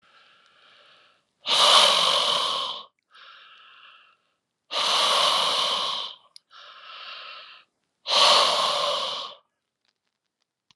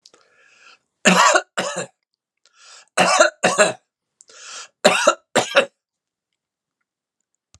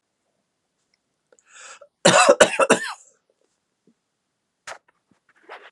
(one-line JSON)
{"exhalation_length": "10.8 s", "exhalation_amplitude": 25057, "exhalation_signal_mean_std_ratio": 0.5, "three_cough_length": "7.6 s", "three_cough_amplitude": 32767, "three_cough_signal_mean_std_ratio": 0.36, "cough_length": "5.7 s", "cough_amplitude": 32768, "cough_signal_mean_std_ratio": 0.26, "survey_phase": "alpha (2021-03-01 to 2021-08-12)", "age": "65+", "gender": "Male", "wearing_mask": "No", "symptom_new_continuous_cough": true, "symptom_headache": true, "smoker_status": "Never smoked", "respiratory_condition_asthma": false, "respiratory_condition_other": false, "recruitment_source": "Test and Trace", "submission_delay": "2 days", "covid_test_result": "Positive", "covid_test_method": "RT-qPCR", "covid_ct_value": 15.2, "covid_ct_gene": "ORF1ab gene", "covid_ct_mean": 15.7, "covid_viral_load": "7300000 copies/ml", "covid_viral_load_category": "High viral load (>1M copies/ml)"}